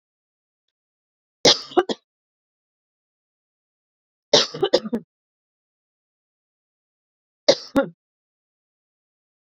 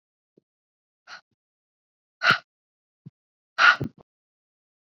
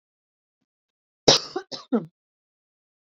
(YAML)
three_cough_length: 9.5 s
three_cough_amplitude: 32295
three_cough_signal_mean_std_ratio: 0.21
exhalation_length: 4.9 s
exhalation_amplitude: 23231
exhalation_signal_mean_std_ratio: 0.2
cough_length: 3.2 s
cough_amplitude: 30737
cough_signal_mean_std_ratio: 0.21
survey_phase: beta (2021-08-13 to 2022-03-07)
age: 18-44
gender: Female
wearing_mask: 'No'
symptom_cough_any: true
symptom_fatigue: true
smoker_status: Ex-smoker
respiratory_condition_asthma: false
respiratory_condition_other: false
recruitment_source: REACT
submission_delay: 1 day
covid_test_result: Negative
covid_test_method: RT-qPCR